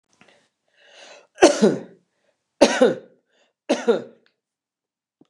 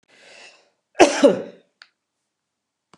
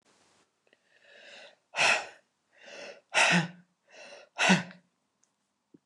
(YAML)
three_cough_length: 5.3 s
three_cough_amplitude: 29204
three_cough_signal_mean_std_ratio: 0.3
cough_length: 3.0 s
cough_amplitude: 29204
cough_signal_mean_std_ratio: 0.25
exhalation_length: 5.9 s
exhalation_amplitude: 10290
exhalation_signal_mean_std_ratio: 0.33
survey_phase: beta (2021-08-13 to 2022-03-07)
age: 65+
gender: Female
wearing_mask: 'No'
symptom_none: true
smoker_status: Ex-smoker
respiratory_condition_asthma: false
respiratory_condition_other: false
recruitment_source: REACT
submission_delay: 1 day
covid_test_result: Negative
covid_test_method: RT-qPCR
influenza_a_test_result: Negative
influenza_b_test_result: Negative